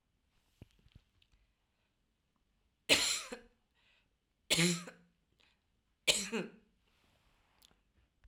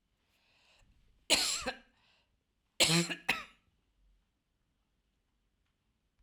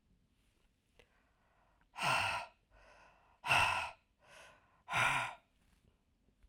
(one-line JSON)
{"three_cough_length": "8.3 s", "three_cough_amplitude": 8736, "three_cough_signal_mean_std_ratio": 0.26, "cough_length": "6.2 s", "cough_amplitude": 8847, "cough_signal_mean_std_ratio": 0.28, "exhalation_length": "6.5 s", "exhalation_amplitude": 4500, "exhalation_signal_mean_std_ratio": 0.37, "survey_phase": "alpha (2021-03-01 to 2021-08-12)", "age": "45-64", "gender": "Female", "wearing_mask": "No", "symptom_none": true, "smoker_status": "Never smoked", "respiratory_condition_asthma": false, "respiratory_condition_other": false, "recruitment_source": "REACT", "submission_delay": "2 days", "covid_test_result": "Negative", "covid_test_method": "RT-qPCR"}